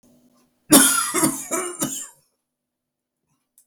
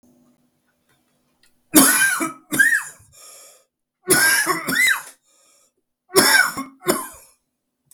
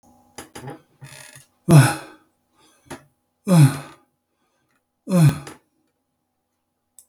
{"cough_length": "3.7 s", "cough_amplitude": 32766, "cough_signal_mean_std_ratio": 0.37, "three_cough_length": "7.9 s", "three_cough_amplitude": 32768, "three_cough_signal_mean_std_ratio": 0.44, "exhalation_length": "7.1 s", "exhalation_amplitude": 29508, "exhalation_signal_mean_std_ratio": 0.29, "survey_phase": "beta (2021-08-13 to 2022-03-07)", "age": "65+", "gender": "Male", "wearing_mask": "No", "symptom_cough_any": true, "symptom_shortness_of_breath": true, "smoker_status": "Never smoked", "respiratory_condition_asthma": false, "respiratory_condition_other": false, "recruitment_source": "REACT", "submission_delay": "1 day", "covid_test_result": "Negative", "covid_test_method": "RT-qPCR", "influenza_a_test_result": "Negative", "influenza_b_test_result": "Negative"}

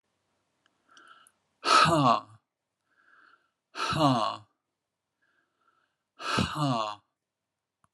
{"exhalation_length": "7.9 s", "exhalation_amplitude": 11580, "exhalation_signal_mean_std_ratio": 0.36, "survey_phase": "alpha (2021-03-01 to 2021-08-12)", "age": "45-64", "gender": "Male", "wearing_mask": "No", "symptom_none": true, "smoker_status": "Never smoked", "respiratory_condition_asthma": true, "respiratory_condition_other": false, "recruitment_source": "REACT", "submission_delay": "3 days", "covid_test_result": "Negative", "covid_test_method": "RT-qPCR"}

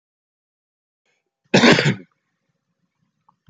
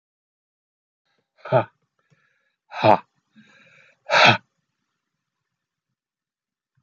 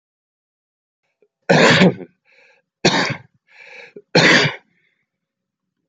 {"cough_length": "3.5 s", "cough_amplitude": 28287, "cough_signal_mean_std_ratio": 0.26, "exhalation_length": "6.8 s", "exhalation_amplitude": 28477, "exhalation_signal_mean_std_ratio": 0.22, "three_cough_length": "5.9 s", "three_cough_amplitude": 32767, "three_cough_signal_mean_std_ratio": 0.35, "survey_phase": "beta (2021-08-13 to 2022-03-07)", "age": "45-64", "gender": "Male", "wearing_mask": "No", "symptom_cough_any": true, "symptom_runny_or_blocked_nose": true, "symptom_sore_throat": true, "symptom_headache": true, "symptom_onset": "3 days", "smoker_status": "Never smoked", "respiratory_condition_asthma": true, "respiratory_condition_other": false, "recruitment_source": "Test and Trace", "submission_delay": "1 day", "covid_test_result": "Positive", "covid_test_method": "RT-qPCR", "covid_ct_value": 25.7, "covid_ct_gene": "ORF1ab gene", "covid_ct_mean": 26.4, "covid_viral_load": "2200 copies/ml", "covid_viral_load_category": "Minimal viral load (< 10K copies/ml)"}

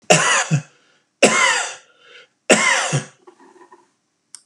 {"three_cough_length": "4.5 s", "three_cough_amplitude": 32768, "three_cough_signal_mean_std_ratio": 0.46, "survey_phase": "beta (2021-08-13 to 2022-03-07)", "age": "45-64", "gender": "Male", "wearing_mask": "No", "symptom_none": true, "smoker_status": "Never smoked", "respiratory_condition_asthma": false, "respiratory_condition_other": false, "recruitment_source": "REACT", "submission_delay": "3 days", "covid_test_result": "Negative", "covid_test_method": "RT-qPCR", "influenza_a_test_result": "Negative", "influenza_b_test_result": "Negative"}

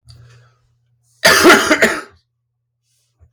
{"cough_length": "3.3 s", "cough_amplitude": 32768, "cough_signal_mean_std_ratio": 0.37, "survey_phase": "beta (2021-08-13 to 2022-03-07)", "age": "45-64", "gender": "Male", "wearing_mask": "No", "symptom_cough_any": true, "symptom_new_continuous_cough": true, "symptom_runny_or_blocked_nose": true, "symptom_sore_throat": true, "symptom_fatigue": true, "symptom_onset": "8 days", "smoker_status": "Never smoked", "respiratory_condition_asthma": false, "respiratory_condition_other": false, "recruitment_source": "Test and Trace", "submission_delay": "2 days", "covid_test_result": "Positive", "covid_test_method": "RT-qPCR", "covid_ct_value": 33.6, "covid_ct_gene": "N gene"}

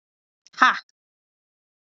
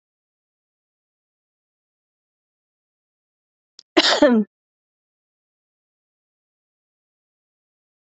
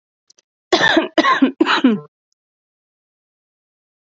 {"exhalation_length": "2.0 s", "exhalation_amplitude": 27519, "exhalation_signal_mean_std_ratio": 0.2, "cough_length": "8.1 s", "cough_amplitude": 28756, "cough_signal_mean_std_ratio": 0.18, "three_cough_length": "4.1 s", "three_cough_amplitude": 30843, "three_cough_signal_mean_std_ratio": 0.39, "survey_phase": "alpha (2021-03-01 to 2021-08-12)", "age": "18-44", "gender": "Female", "wearing_mask": "No", "symptom_cough_any": true, "symptom_fever_high_temperature": true, "symptom_headache": true, "symptom_change_to_sense_of_smell_or_taste": true, "symptom_onset": "4 days", "smoker_status": "Ex-smoker", "respiratory_condition_asthma": false, "respiratory_condition_other": false, "recruitment_source": "Test and Trace", "submission_delay": "1 day", "covid_test_result": "Positive", "covid_test_method": "RT-qPCR", "covid_ct_value": 12.1, "covid_ct_gene": "ORF1ab gene", "covid_ct_mean": 12.3, "covid_viral_load": "93000000 copies/ml", "covid_viral_load_category": "High viral load (>1M copies/ml)"}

